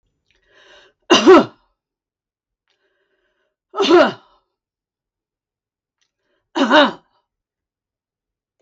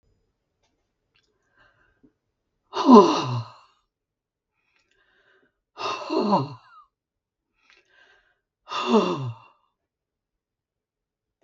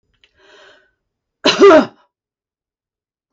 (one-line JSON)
{"three_cough_length": "8.6 s", "three_cough_amplitude": 32768, "three_cough_signal_mean_std_ratio": 0.26, "exhalation_length": "11.4 s", "exhalation_amplitude": 32768, "exhalation_signal_mean_std_ratio": 0.25, "cough_length": "3.3 s", "cough_amplitude": 32768, "cough_signal_mean_std_ratio": 0.28, "survey_phase": "beta (2021-08-13 to 2022-03-07)", "age": "65+", "gender": "Female", "wearing_mask": "No", "symptom_none": true, "smoker_status": "Never smoked", "respiratory_condition_asthma": true, "respiratory_condition_other": false, "recruitment_source": "REACT", "submission_delay": "1 day", "covid_test_result": "Negative", "covid_test_method": "RT-qPCR", "influenza_a_test_result": "Negative", "influenza_b_test_result": "Negative"}